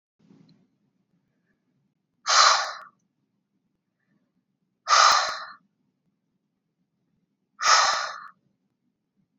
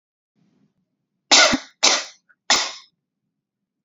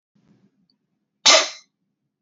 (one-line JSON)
{"exhalation_length": "9.4 s", "exhalation_amplitude": 22061, "exhalation_signal_mean_std_ratio": 0.3, "three_cough_length": "3.8 s", "three_cough_amplitude": 32768, "three_cough_signal_mean_std_ratio": 0.31, "cough_length": "2.2 s", "cough_amplitude": 28949, "cough_signal_mean_std_ratio": 0.24, "survey_phase": "beta (2021-08-13 to 2022-03-07)", "age": "18-44", "gender": "Female", "wearing_mask": "No", "symptom_cough_any": true, "symptom_onset": "5 days", "smoker_status": "Never smoked", "respiratory_condition_asthma": false, "respiratory_condition_other": false, "recruitment_source": "REACT", "submission_delay": "2 days", "covid_test_result": "Negative", "covid_test_method": "RT-qPCR", "influenza_a_test_result": "Negative", "influenza_b_test_result": "Negative"}